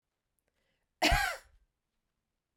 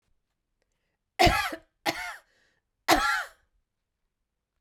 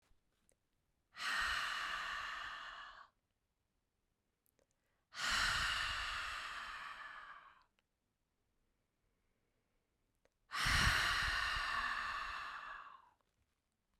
cough_length: 2.6 s
cough_amplitude: 6326
cough_signal_mean_std_ratio: 0.28
three_cough_length: 4.6 s
three_cough_amplitude: 16838
three_cough_signal_mean_std_ratio: 0.32
exhalation_length: 14.0 s
exhalation_amplitude: 2646
exhalation_signal_mean_std_ratio: 0.53
survey_phase: beta (2021-08-13 to 2022-03-07)
age: 45-64
gender: Female
wearing_mask: 'No'
symptom_none: true
smoker_status: Never smoked
respiratory_condition_asthma: false
respiratory_condition_other: false
recruitment_source: Test and Trace
submission_delay: -1 day
covid_test_result: Negative
covid_test_method: LFT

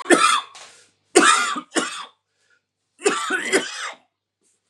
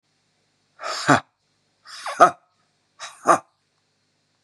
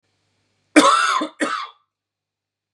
three_cough_length: 4.7 s
three_cough_amplitude: 32397
three_cough_signal_mean_std_ratio: 0.45
exhalation_length: 4.4 s
exhalation_amplitude: 32566
exhalation_signal_mean_std_ratio: 0.24
cough_length: 2.7 s
cough_amplitude: 32767
cough_signal_mean_std_ratio: 0.38
survey_phase: beta (2021-08-13 to 2022-03-07)
age: 45-64
gender: Male
wearing_mask: 'No'
symptom_cough_any: true
symptom_new_continuous_cough: true
symptom_runny_or_blocked_nose: true
symptom_fatigue: true
symptom_headache: true
symptom_onset: 3 days
smoker_status: Ex-smoker
respiratory_condition_asthma: false
respiratory_condition_other: false
recruitment_source: Test and Trace
submission_delay: 1 day
covid_test_result: Positive
covid_test_method: RT-qPCR
covid_ct_value: 18.1
covid_ct_gene: ORF1ab gene
covid_ct_mean: 18.9
covid_viral_load: 620000 copies/ml
covid_viral_load_category: Low viral load (10K-1M copies/ml)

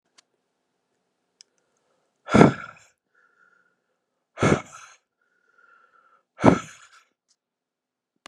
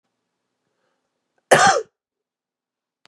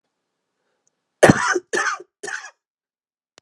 exhalation_length: 8.3 s
exhalation_amplitude: 32768
exhalation_signal_mean_std_ratio: 0.19
cough_length: 3.1 s
cough_amplitude: 31712
cough_signal_mean_std_ratio: 0.24
three_cough_length: 3.4 s
three_cough_amplitude: 32768
three_cough_signal_mean_std_ratio: 0.28
survey_phase: beta (2021-08-13 to 2022-03-07)
age: 18-44
gender: Male
wearing_mask: 'No'
symptom_cough_any: true
symptom_runny_or_blocked_nose: true
symptom_onset: 12 days
smoker_status: Never smoked
respiratory_condition_asthma: false
respiratory_condition_other: false
recruitment_source: REACT
submission_delay: 0 days
covid_test_result: Negative
covid_test_method: RT-qPCR
influenza_a_test_result: Negative
influenza_b_test_result: Negative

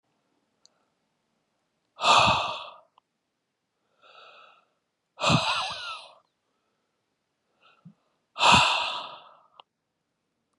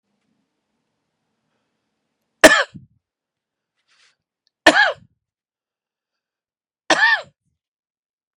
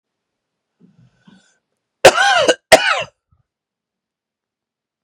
exhalation_length: 10.6 s
exhalation_amplitude: 18280
exhalation_signal_mean_std_ratio: 0.31
three_cough_length: 8.4 s
three_cough_amplitude: 32768
three_cough_signal_mean_std_ratio: 0.21
cough_length: 5.0 s
cough_amplitude: 32768
cough_signal_mean_std_ratio: 0.28
survey_phase: beta (2021-08-13 to 2022-03-07)
age: 45-64
gender: Male
wearing_mask: 'No'
symptom_cough_any: true
symptom_new_continuous_cough: true
symptom_shortness_of_breath: true
symptom_abdominal_pain: true
symptom_fatigue: true
symptom_fever_high_temperature: true
symptom_headache: true
symptom_onset: 2 days
smoker_status: Current smoker (e-cigarettes or vapes only)
respiratory_condition_asthma: false
respiratory_condition_other: false
recruitment_source: Test and Trace
submission_delay: 2 days
covid_test_result: Positive
covid_test_method: RT-qPCR
covid_ct_value: 22.2
covid_ct_gene: ORF1ab gene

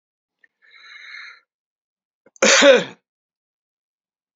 cough_length: 4.4 s
cough_amplitude: 29215
cough_signal_mean_std_ratio: 0.26
survey_phase: beta (2021-08-13 to 2022-03-07)
age: 65+
gender: Male
wearing_mask: 'No'
symptom_none: true
smoker_status: Never smoked
respiratory_condition_asthma: false
respiratory_condition_other: false
recruitment_source: REACT
submission_delay: 1 day
covid_test_result: Negative
covid_test_method: RT-qPCR
influenza_a_test_result: Negative
influenza_b_test_result: Negative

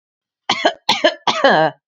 three_cough_length: 1.9 s
three_cough_amplitude: 32767
three_cough_signal_mean_std_ratio: 0.52
survey_phase: beta (2021-08-13 to 2022-03-07)
age: 45-64
gender: Female
wearing_mask: 'No'
symptom_none: true
smoker_status: Never smoked
respiratory_condition_asthma: false
respiratory_condition_other: false
recruitment_source: REACT
submission_delay: 1 day
covid_test_result: Negative
covid_test_method: RT-qPCR
influenza_a_test_result: Negative
influenza_b_test_result: Negative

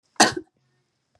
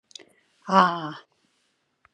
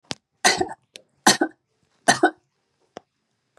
cough_length: 1.2 s
cough_amplitude: 31218
cough_signal_mean_std_ratio: 0.25
exhalation_length: 2.1 s
exhalation_amplitude: 22512
exhalation_signal_mean_std_ratio: 0.29
three_cough_length: 3.6 s
three_cough_amplitude: 32222
three_cough_signal_mean_std_ratio: 0.28
survey_phase: beta (2021-08-13 to 2022-03-07)
age: 65+
gender: Female
wearing_mask: 'No'
symptom_runny_or_blocked_nose: true
symptom_fatigue: true
symptom_onset: 12 days
smoker_status: Never smoked
respiratory_condition_asthma: false
respiratory_condition_other: false
recruitment_source: REACT
submission_delay: 2 days
covid_test_result: Negative
covid_test_method: RT-qPCR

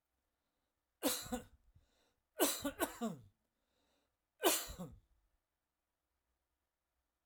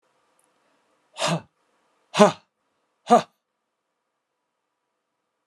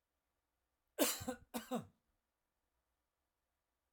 three_cough_length: 7.3 s
three_cough_amplitude: 4484
three_cough_signal_mean_std_ratio: 0.3
exhalation_length: 5.5 s
exhalation_amplitude: 30688
exhalation_signal_mean_std_ratio: 0.2
cough_length: 3.9 s
cough_amplitude: 3615
cough_signal_mean_std_ratio: 0.26
survey_phase: alpha (2021-03-01 to 2021-08-12)
age: 65+
gender: Male
wearing_mask: 'No'
symptom_change_to_sense_of_smell_or_taste: true
smoker_status: Never smoked
respiratory_condition_asthma: false
respiratory_condition_other: false
recruitment_source: REACT
submission_delay: 2 days
covid_test_result: Negative
covid_test_method: RT-qPCR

